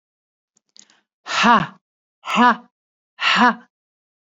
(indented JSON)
{
  "exhalation_length": "4.4 s",
  "exhalation_amplitude": 27982,
  "exhalation_signal_mean_std_ratio": 0.37,
  "survey_phase": "beta (2021-08-13 to 2022-03-07)",
  "age": "45-64",
  "gender": "Female",
  "wearing_mask": "No",
  "symptom_none": true,
  "symptom_onset": "13 days",
  "smoker_status": "Ex-smoker",
  "respiratory_condition_asthma": false,
  "respiratory_condition_other": false,
  "recruitment_source": "REACT",
  "submission_delay": "3 days",
  "covid_test_result": "Negative",
  "covid_test_method": "RT-qPCR",
  "influenza_a_test_result": "Negative",
  "influenza_b_test_result": "Negative"
}